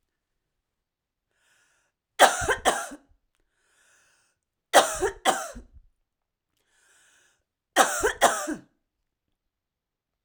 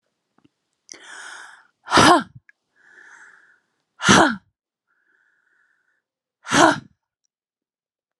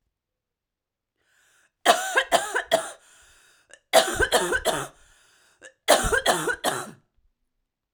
three_cough_length: 10.2 s
three_cough_amplitude: 28889
three_cough_signal_mean_std_ratio: 0.28
exhalation_length: 8.2 s
exhalation_amplitude: 32768
exhalation_signal_mean_std_ratio: 0.27
cough_length: 7.9 s
cough_amplitude: 24673
cough_signal_mean_std_ratio: 0.41
survey_phase: alpha (2021-03-01 to 2021-08-12)
age: 18-44
gender: Female
wearing_mask: 'No'
symptom_none: true
smoker_status: Never smoked
respiratory_condition_asthma: true
respiratory_condition_other: false
recruitment_source: REACT
submission_delay: 4 days
covid_test_result: Negative
covid_test_method: RT-qPCR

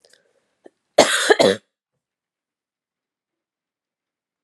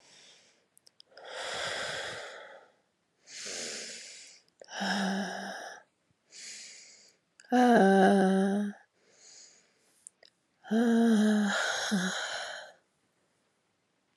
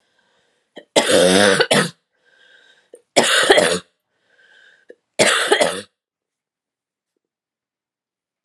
cough_length: 4.4 s
cough_amplitude: 32768
cough_signal_mean_std_ratio: 0.24
exhalation_length: 14.2 s
exhalation_amplitude: 10395
exhalation_signal_mean_std_ratio: 0.47
three_cough_length: 8.4 s
three_cough_amplitude: 32767
three_cough_signal_mean_std_ratio: 0.39
survey_phase: beta (2021-08-13 to 2022-03-07)
age: 18-44
gender: Female
wearing_mask: 'No'
symptom_runny_or_blocked_nose: true
symptom_diarrhoea: true
symptom_fatigue: true
symptom_other: true
smoker_status: Never smoked
respiratory_condition_asthma: false
respiratory_condition_other: false
recruitment_source: Test and Trace
submission_delay: 3 days
covid_test_result: Positive
covid_test_method: RT-qPCR
covid_ct_value: 17.8
covid_ct_gene: ORF1ab gene
covid_ct_mean: 18.3
covid_viral_load: 960000 copies/ml
covid_viral_load_category: Low viral load (10K-1M copies/ml)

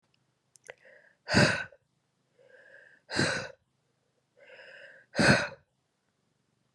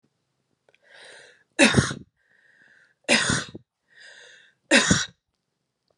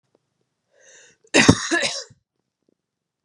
exhalation_length: 6.7 s
exhalation_amplitude: 11722
exhalation_signal_mean_std_ratio: 0.3
three_cough_length: 6.0 s
three_cough_amplitude: 25634
three_cough_signal_mean_std_ratio: 0.31
cough_length: 3.2 s
cough_amplitude: 32768
cough_signal_mean_std_ratio: 0.28
survey_phase: beta (2021-08-13 to 2022-03-07)
age: 18-44
gender: Female
wearing_mask: 'No'
symptom_cough_any: true
symptom_runny_or_blocked_nose: true
symptom_fatigue: true
symptom_headache: true
smoker_status: Never smoked
respiratory_condition_asthma: false
respiratory_condition_other: false
recruitment_source: Test and Trace
submission_delay: 2 days
covid_test_result: Positive
covid_test_method: RT-qPCR
covid_ct_value: 17.9
covid_ct_gene: N gene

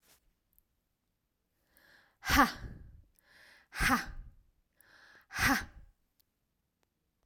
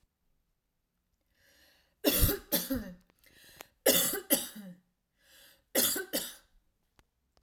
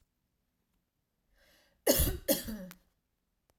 exhalation_length: 7.3 s
exhalation_amplitude: 9018
exhalation_signal_mean_std_ratio: 0.29
three_cough_length: 7.4 s
three_cough_amplitude: 10723
three_cough_signal_mean_std_ratio: 0.36
cough_length: 3.6 s
cough_amplitude: 8468
cough_signal_mean_std_ratio: 0.3
survey_phase: beta (2021-08-13 to 2022-03-07)
age: 18-44
gender: Female
wearing_mask: 'No'
symptom_other: true
symptom_onset: 4 days
smoker_status: Ex-smoker
respiratory_condition_asthma: false
respiratory_condition_other: false
recruitment_source: REACT
submission_delay: 1 day
covid_test_result: Negative
covid_test_method: RT-qPCR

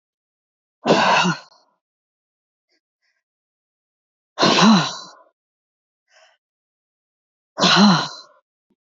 exhalation_length: 9.0 s
exhalation_amplitude: 28034
exhalation_signal_mean_std_ratio: 0.34
survey_phase: beta (2021-08-13 to 2022-03-07)
age: 45-64
gender: Female
wearing_mask: 'No'
symptom_cough_any: true
symptom_runny_or_blocked_nose: true
smoker_status: Never smoked
respiratory_condition_asthma: false
respiratory_condition_other: false
recruitment_source: Test and Trace
submission_delay: 2 days
covid_test_result: Negative
covid_test_method: RT-qPCR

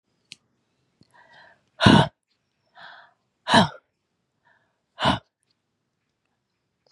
exhalation_length: 6.9 s
exhalation_amplitude: 31205
exhalation_signal_mean_std_ratio: 0.23
survey_phase: beta (2021-08-13 to 2022-03-07)
age: 65+
gender: Female
wearing_mask: 'No'
symptom_cough_any: true
symptom_runny_or_blocked_nose: true
symptom_sore_throat: true
symptom_fatigue: true
smoker_status: Ex-smoker
respiratory_condition_asthma: false
respiratory_condition_other: false
recruitment_source: REACT
submission_delay: 2 days
covid_test_result: Positive
covid_test_method: RT-qPCR
covid_ct_value: 22.0
covid_ct_gene: E gene
influenza_a_test_result: Negative
influenza_b_test_result: Negative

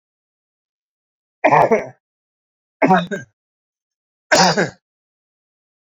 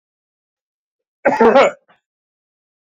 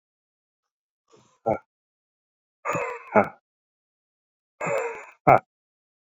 three_cough_length: 6.0 s
three_cough_amplitude: 30641
three_cough_signal_mean_std_ratio: 0.32
cough_length: 2.8 s
cough_amplitude: 28061
cough_signal_mean_std_ratio: 0.32
exhalation_length: 6.1 s
exhalation_amplitude: 30388
exhalation_signal_mean_std_ratio: 0.25
survey_phase: beta (2021-08-13 to 2022-03-07)
age: 65+
gender: Male
wearing_mask: 'No'
symptom_none: true
smoker_status: Ex-smoker
respiratory_condition_asthma: false
respiratory_condition_other: false
recruitment_source: REACT
submission_delay: 1 day
covid_test_result: Negative
covid_test_method: RT-qPCR
influenza_a_test_result: Unknown/Void
influenza_b_test_result: Unknown/Void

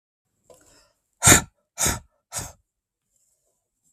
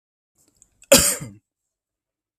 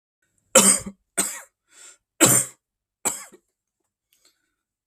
exhalation_length: 3.9 s
exhalation_amplitude: 32768
exhalation_signal_mean_std_ratio: 0.23
cough_length: 2.4 s
cough_amplitude: 32768
cough_signal_mean_std_ratio: 0.24
three_cough_length: 4.9 s
three_cough_amplitude: 32768
three_cough_signal_mean_std_ratio: 0.29
survey_phase: beta (2021-08-13 to 2022-03-07)
age: 18-44
gender: Male
wearing_mask: 'No'
symptom_none: true
smoker_status: Never smoked
respiratory_condition_asthma: false
respiratory_condition_other: false
recruitment_source: REACT
submission_delay: 2 days
covid_test_result: Negative
covid_test_method: RT-qPCR
influenza_a_test_result: Negative
influenza_b_test_result: Negative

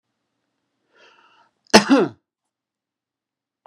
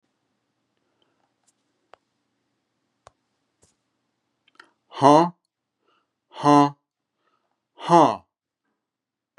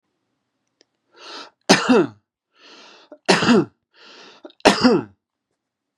cough_length: 3.7 s
cough_amplitude: 32768
cough_signal_mean_std_ratio: 0.21
exhalation_length: 9.4 s
exhalation_amplitude: 30296
exhalation_signal_mean_std_ratio: 0.22
three_cough_length: 6.0 s
three_cough_amplitude: 32768
three_cough_signal_mean_std_ratio: 0.34
survey_phase: beta (2021-08-13 to 2022-03-07)
age: 45-64
gender: Male
wearing_mask: 'No'
symptom_none: true
smoker_status: Never smoked
respiratory_condition_asthma: false
respiratory_condition_other: false
recruitment_source: REACT
submission_delay: 1 day
covid_test_result: Negative
covid_test_method: RT-qPCR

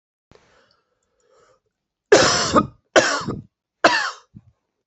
three_cough_length: 4.9 s
three_cough_amplitude: 27954
three_cough_signal_mean_std_ratio: 0.35
survey_phase: beta (2021-08-13 to 2022-03-07)
age: 18-44
gender: Female
wearing_mask: 'No'
symptom_cough_any: true
symptom_runny_or_blocked_nose: true
symptom_shortness_of_breath: true
symptom_fatigue: true
symptom_headache: true
symptom_change_to_sense_of_smell_or_taste: true
symptom_loss_of_taste: true
symptom_onset: 3 days
smoker_status: Ex-smoker
respiratory_condition_asthma: true
respiratory_condition_other: false
recruitment_source: Test and Trace
submission_delay: 2 days
covid_test_result: Positive
covid_test_method: RT-qPCR
covid_ct_value: 16.6
covid_ct_gene: ORF1ab gene
covid_ct_mean: 17.1
covid_viral_load: 2400000 copies/ml
covid_viral_load_category: High viral load (>1M copies/ml)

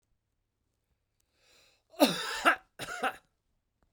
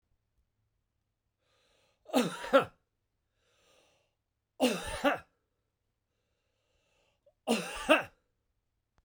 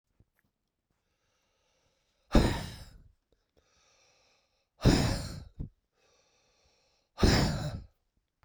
cough_length: 3.9 s
cough_amplitude: 14166
cough_signal_mean_std_ratio: 0.29
three_cough_length: 9.0 s
three_cough_amplitude: 9319
three_cough_signal_mean_std_ratio: 0.27
exhalation_length: 8.4 s
exhalation_amplitude: 11320
exhalation_signal_mean_std_ratio: 0.3
survey_phase: beta (2021-08-13 to 2022-03-07)
age: 65+
gender: Male
wearing_mask: 'No'
symptom_none: true
smoker_status: Never smoked
respiratory_condition_asthma: false
respiratory_condition_other: false
recruitment_source: REACT
submission_delay: 1 day
covid_test_result: Negative
covid_test_method: RT-qPCR
influenza_a_test_result: Unknown/Void
influenza_b_test_result: Unknown/Void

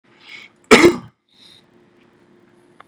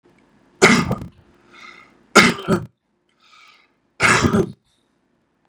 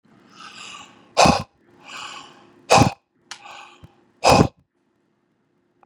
cough_length: 2.9 s
cough_amplitude: 32768
cough_signal_mean_std_ratio: 0.23
three_cough_length: 5.5 s
three_cough_amplitude: 32768
three_cough_signal_mean_std_ratio: 0.34
exhalation_length: 5.9 s
exhalation_amplitude: 32768
exhalation_signal_mean_std_ratio: 0.29
survey_phase: beta (2021-08-13 to 2022-03-07)
age: 45-64
gender: Male
wearing_mask: 'No'
symptom_none: true
smoker_status: Ex-smoker
respiratory_condition_asthma: false
respiratory_condition_other: false
recruitment_source: REACT
submission_delay: 1 day
covid_test_result: Negative
covid_test_method: RT-qPCR
influenza_a_test_result: Negative
influenza_b_test_result: Negative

